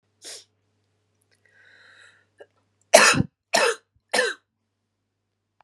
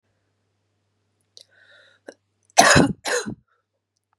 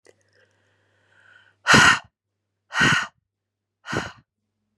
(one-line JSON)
{"three_cough_length": "5.6 s", "three_cough_amplitude": 32768, "three_cough_signal_mean_std_ratio": 0.26, "cough_length": "4.2 s", "cough_amplitude": 32768, "cough_signal_mean_std_ratio": 0.26, "exhalation_length": "4.8 s", "exhalation_amplitude": 27032, "exhalation_signal_mean_std_ratio": 0.3, "survey_phase": "beta (2021-08-13 to 2022-03-07)", "age": "18-44", "gender": "Female", "wearing_mask": "No", "symptom_cough_any": true, "symptom_runny_or_blocked_nose": true, "symptom_shortness_of_breath": true, "symptom_fatigue": true, "symptom_fever_high_temperature": true, "symptom_headache": true, "symptom_onset": "2 days", "smoker_status": "Never smoked", "respiratory_condition_asthma": false, "respiratory_condition_other": false, "recruitment_source": "Test and Trace", "submission_delay": "1 day", "covid_test_result": "Positive", "covid_test_method": "ePCR"}